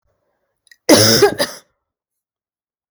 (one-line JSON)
{"cough_length": "2.9 s", "cough_amplitude": 32768, "cough_signal_mean_std_ratio": 0.34, "survey_phase": "beta (2021-08-13 to 2022-03-07)", "age": "18-44", "gender": "Female", "wearing_mask": "No", "symptom_cough_any": true, "symptom_runny_or_blocked_nose": true, "symptom_sore_throat": true, "symptom_fatigue": true, "symptom_onset": "7 days", "smoker_status": "Never smoked", "respiratory_condition_asthma": false, "respiratory_condition_other": false, "recruitment_source": "Test and Trace", "submission_delay": "2 days", "covid_test_result": "Positive", "covid_test_method": "RT-qPCR", "covid_ct_value": 18.1, "covid_ct_gene": "N gene"}